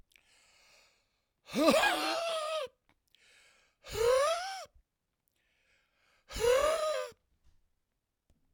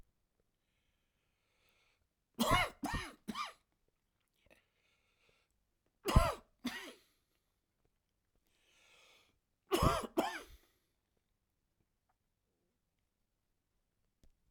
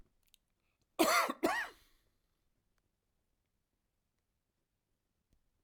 {
  "exhalation_length": "8.5 s",
  "exhalation_amplitude": 9428,
  "exhalation_signal_mean_std_ratio": 0.45,
  "three_cough_length": "14.5 s",
  "three_cough_amplitude": 7579,
  "three_cough_signal_mean_std_ratio": 0.24,
  "cough_length": "5.6 s",
  "cough_amplitude": 5166,
  "cough_signal_mean_std_ratio": 0.25,
  "survey_phase": "beta (2021-08-13 to 2022-03-07)",
  "age": "65+",
  "gender": "Male",
  "wearing_mask": "No",
  "symptom_cough_any": true,
  "symptom_fatigue": true,
  "symptom_change_to_sense_of_smell_or_taste": true,
  "symptom_loss_of_taste": true,
  "symptom_onset": "12 days",
  "smoker_status": "Never smoked",
  "respiratory_condition_asthma": false,
  "respiratory_condition_other": false,
  "recruitment_source": "REACT",
  "submission_delay": "1 day",
  "covid_test_result": "Negative",
  "covid_test_method": "RT-qPCR",
  "covid_ct_value": 44.0,
  "covid_ct_gene": "N gene"
}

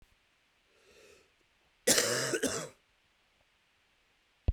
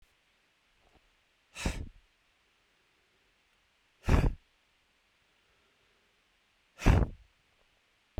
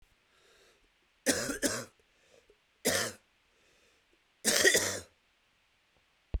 {
  "cough_length": "4.5 s",
  "cough_amplitude": 16680,
  "cough_signal_mean_std_ratio": 0.32,
  "exhalation_length": "8.2 s",
  "exhalation_amplitude": 10432,
  "exhalation_signal_mean_std_ratio": 0.23,
  "three_cough_length": "6.4 s",
  "three_cough_amplitude": 16143,
  "three_cough_signal_mean_std_ratio": 0.34,
  "survey_phase": "beta (2021-08-13 to 2022-03-07)",
  "age": "45-64",
  "gender": "Male",
  "wearing_mask": "No",
  "symptom_cough_any": true,
  "symptom_runny_or_blocked_nose": true,
  "symptom_change_to_sense_of_smell_or_taste": true,
  "symptom_loss_of_taste": true,
  "symptom_onset": "6 days",
  "smoker_status": "Current smoker (e-cigarettes or vapes only)",
  "respiratory_condition_asthma": true,
  "respiratory_condition_other": false,
  "recruitment_source": "Test and Trace",
  "submission_delay": "2 days",
  "covid_test_result": "Positive",
  "covid_test_method": "RT-qPCR",
  "covid_ct_value": 18.0,
  "covid_ct_gene": "ORF1ab gene",
  "covid_ct_mean": 18.8,
  "covid_viral_load": "690000 copies/ml",
  "covid_viral_load_category": "Low viral load (10K-1M copies/ml)"
}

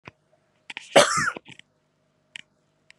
{
  "cough_length": "3.0 s",
  "cough_amplitude": 27258,
  "cough_signal_mean_std_ratio": 0.25,
  "survey_phase": "beta (2021-08-13 to 2022-03-07)",
  "age": "18-44",
  "gender": "Female",
  "wearing_mask": "No",
  "symptom_runny_or_blocked_nose": true,
  "symptom_sore_throat": true,
  "symptom_abdominal_pain": true,
  "symptom_fatigue": true,
  "symptom_fever_high_temperature": true,
  "symptom_headache": true,
  "symptom_change_to_sense_of_smell_or_taste": true,
  "symptom_loss_of_taste": true,
  "symptom_onset": "3 days",
  "smoker_status": "Never smoked",
  "respiratory_condition_asthma": false,
  "respiratory_condition_other": false,
  "recruitment_source": "Test and Trace",
  "submission_delay": "1 day",
  "covid_test_result": "Positive",
  "covid_test_method": "RT-qPCR",
  "covid_ct_value": 24.8,
  "covid_ct_gene": "ORF1ab gene"
}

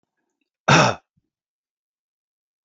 {
  "cough_length": "2.6 s",
  "cough_amplitude": 27722,
  "cough_signal_mean_std_ratio": 0.24,
  "survey_phase": "alpha (2021-03-01 to 2021-08-12)",
  "age": "45-64",
  "gender": "Male",
  "wearing_mask": "No",
  "symptom_cough_any": true,
  "smoker_status": "Never smoked",
  "respiratory_condition_asthma": false,
  "respiratory_condition_other": false,
  "recruitment_source": "REACT",
  "submission_delay": "1 day",
  "covid_test_result": "Negative",
  "covid_test_method": "RT-qPCR"
}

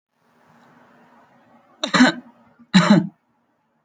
{
  "cough_length": "3.8 s",
  "cough_amplitude": 28488,
  "cough_signal_mean_std_ratio": 0.3,
  "survey_phase": "alpha (2021-03-01 to 2021-08-12)",
  "age": "18-44",
  "gender": "Male",
  "wearing_mask": "Yes",
  "symptom_none": true,
  "smoker_status": "Current smoker (e-cigarettes or vapes only)",
  "respiratory_condition_asthma": false,
  "respiratory_condition_other": false,
  "recruitment_source": "REACT",
  "submission_delay": "1 day",
  "covid_test_result": "Negative",
  "covid_test_method": "RT-qPCR"
}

